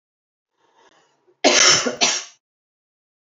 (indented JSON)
{
  "cough_length": "3.2 s",
  "cough_amplitude": 29244,
  "cough_signal_mean_std_ratio": 0.35,
  "survey_phase": "beta (2021-08-13 to 2022-03-07)",
  "age": "45-64",
  "gender": "Female",
  "wearing_mask": "No",
  "symptom_runny_or_blocked_nose": true,
  "symptom_sore_throat": true,
  "symptom_fatigue": true,
  "symptom_loss_of_taste": true,
  "smoker_status": "Never smoked",
  "respiratory_condition_asthma": false,
  "respiratory_condition_other": false,
  "recruitment_source": "Test and Trace",
  "submission_delay": "2 days",
  "covid_test_result": "Positive",
  "covid_test_method": "LFT"
}